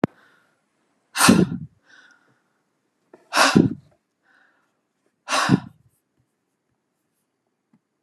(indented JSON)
{
  "exhalation_length": "8.0 s",
  "exhalation_amplitude": 31921,
  "exhalation_signal_mean_std_ratio": 0.27,
  "survey_phase": "beta (2021-08-13 to 2022-03-07)",
  "age": "65+",
  "gender": "Female",
  "wearing_mask": "No",
  "symptom_none": true,
  "smoker_status": "Ex-smoker",
  "respiratory_condition_asthma": false,
  "respiratory_condition_other": false,
  "recruitment_source": "REACT",
  "submission_delay": "2 days",
  "covid_test_result": "Negative",
  "covid_test_method": "RT-qPCR"
}